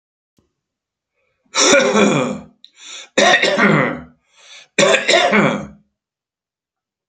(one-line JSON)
{"three_cough_length": "7.1 s", "three_cough_amplitude": 32767, "three_cough_signal_mean_std_ratio": 0.5, "survey_phase": "beta (2021-08-13 to 2022-03-07)", "age": "65+", "gender": "Male", "wearing_mask": "No", "symptom_none": true, "smoker_status": "Never smoked", "respiratory_condition_asthma": false, "respiratory_condition_other": false, "recruitment_source": "REACT", "submission_delay": "2 days", "covid_test_result": "Negative", "covid_test_method": "RT-qPCR"}